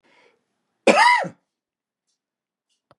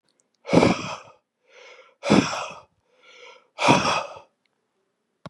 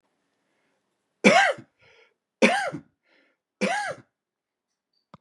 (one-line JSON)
{"cough_length": "3.0 s", "cough_amplitude": 28904, "cough_signal_mean_std_ratio": 0.28, "exhalation_length": "5.3 s", "exhalation_amplitude": 29983, "exhalation_signal_mean_std_ratio": 0.36, "three_cough_length": "5.2 s", "three_cough_amplitude": 30107, "three_cough_signal_mean_std_ratio": 0.3, "survey_phase": "beta (2021-08-13 to 2022-03-07)", "age": "45-64", "gender": "Male", "wearing_mask": "No", "symptom_none": true, "smoker_status": "Never smoked", "respiratory_condition_asthma": false, "respiratory_condition_other": false, "recruitment_source": "REACT", "submission_delay": "1 day", "covid_test_result": "Negative", "covid_test_method": "RT-qPCR", "influenza_a_test_result": "Negative", "influenza_b_test_result": "Negative"}